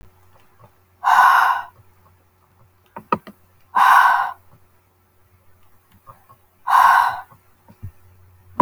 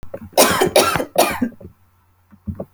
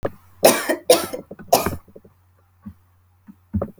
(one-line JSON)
{"exhalation_length": "8.6 s", "exhalation_amplitude": 27447, "exhalation_signal_mean_std_ratio": 0.37, "cough_length": "2.7 s", "cough_amplitude": 32768, "cough_signal_mean_std_ratio": 0.5, "three_cough_length": "3.8 s", "three_cough_amplitude": 32768, "three_cough_signal_mean_std_ratio": 0.35, "survey_phase": "alpha (2021-03-01 to 2021-08-12)", "age": "18-44", "gender": "Female", "wearing_mask": "No", "symptom_diarrhoea": true, "smoker_status": "Never smoked", "respiratory_condition_asthma": false, "respiratory_condition_other": false, "recruitment_source": "REACT", "submission_delay": "2 days", "covid_test_result": "Negative", "covid_test_method": "RT-qPCR"}